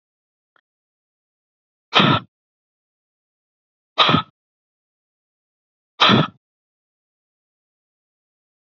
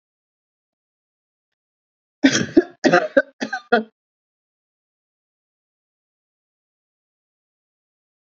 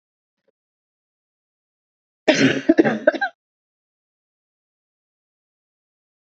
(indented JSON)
{
  "exhalation_length": "8.7 s",
  "exhalation_amplitude": 29957,
  "exhalation_signal_mean_std_ratio": 0.23,
  "three_cough_length": "8.3 s",
  "three_cough_amplitude": 27575,
  "three_cough_signal_mean_std_ratio": 0.21,
  "cough_length": "6.3 s",
  "cough_amplitude": 31255,
  "cough_signal_mean_std_ratio": 0.24,
  "survey_phase": "alpha (2021-03-01 to 2021-08-12)",
  "age": "65+",
  "gender": "Female",
  "wearing_mask": "No",
  "symptom_none": true,
  "smoker_status": "Ex-smoker",
  "respiratory_condition_asthma": false,
  "respiratory_condition_other": false,
  "recruitment_source": "REACT",
  "submission_delay": "1 day",
  "covid_test_result": "Negative",
  "covid_test_method": "RT-qPCR"
}